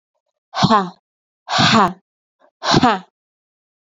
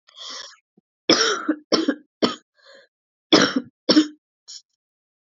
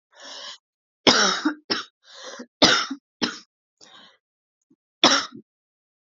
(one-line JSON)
{"exhalation_length": "3.8 s", "exhalation_amplitude": 29212, "exhalation_signal_mean_std_ratio": 0.41, "cough_length": "5.2 s", "cough_amplitude": 32594, "cough_signal_mean_std_ratio": 0.36, "three_cough_length": "6.1 s", "three_cough_amplitude": 32767, "three_cough_signal_mean_std_ratio": 0.33, "survey_phase": "alpha (2021-03-01 to 2021-08-12)", "age": "18-44", "gender": "Female", "wearing_mask": "No", "symptom_cough_any": true, "symptom_fatigue": true, "symptom_headache": true, "symptom_change_to_sense_of_smell_or_taste": true, "symptom_loss_of_taste": true, "smoker_status": "Never smoked", "respiratory_condition_asthma": false, "respiratory_condition_other": false, "recruitment_source": "Test and Trace", "submission_delay": "2 days", "covid_test_result": "Positive", "covid_test_method": "RT-qPCR", "covid_ct_value": 21.9, "covid_ct_gene": "N gene"}